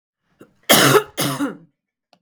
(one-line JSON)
{"cough_length": "2.2 s", "cough_amplitude": 32768, "cough_signal_mean_std_ratio": 0.41, "survey_phase": "beta (2021-08-13 to 2022-03-07)", "age": "45-64", "gender": "Female", "wearing_mask": "No", "symptom_cough_any": true, "symptom_runny_or_blocked_nose": true, "symptom_fatigue": true, "symptom_headache": true, "smoker_status": "Ex-smoker", "respiratory_condition_asthma": false, "respiratory_condition_other": false, "recruitment_source": "Test and Trace", "submission_delay": "2 days", "covid_test_result": "Positive", "covid_test_method": "RT-qPCR"}